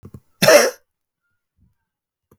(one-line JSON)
{"cough_length": "2.4 s", "cough_amplitude": 32768, "cough_signal_mean_std_ratio": 0.27, "survey_phase": "beta (2021-08-13 to 2022-03-07)", "age": "18-44", "gender": "Male", "wearing_mask": "No", "symptom_cough_any": true, "symptom_shortness_of_breath": true, "symptom_fatigue": true, "symptom_change_to_sense_of_smell_or_taste": true, "symptom_onset": "3 days", "smoker_status": "Ex-smoker", "respiratory_condition_asthma": false, "respiratory_condition_other": false, "recruitment_source": "Test and Trace", "submission_delay": "2 days", "covid_test_result": "Positive", "covid_test_method": "RT-qPCR", "covid_ct_value": 20.3, "covid_ct_gene": "ORF1ab gene"}